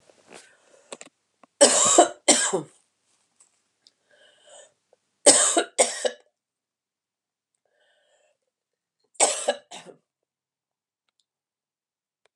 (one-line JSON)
{"three_cough_length": "12.4 s", "three_cough_amplitude": 31154, "three_cough_signal_mean_std_ratio": 0.27, "survey_phase": "beta (2021-08-13 to 2022-03-07)", "age": "45-64", "gender": "Female", "wearing_mask": "No", "symptom_fatigue": true, "smoker_status": "Never smoked", "respiratory_condition_asthma": false, "respiratory_condition_other": false, "recruitment_source": "Test and Trace", "submission_delay": "2 days", "covid_test_result": "Positive", "covid_test_method": "RT-qPCR", "covid_ct_value": 37.2, "covid_ct_gene": "ORF1ab gene"}